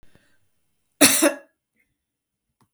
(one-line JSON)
{"cough_length": "2.7 s", "cough_amplitude": 32768, "cough_signal_mean_std_ratio": 0.26, "survey_phase": "beta (2021-08-13 to 2022-03-07)", "age": "65+", "gender": "Female", "wearing_mask": "No", "symptom_runny_or_blocked_nose": true, "smoker_status": "Never smoked", "respiratory_condition_asthma": false, "respiratory_condition_other": false, "recruitment_source": "REACT", "submission_delay": "2 days", "covid_test_result": "Negative", "covid_test_method": "RT-qPCR", "influenza_a_test_result": "Negative", "influenza_b_test_result": "Negative"}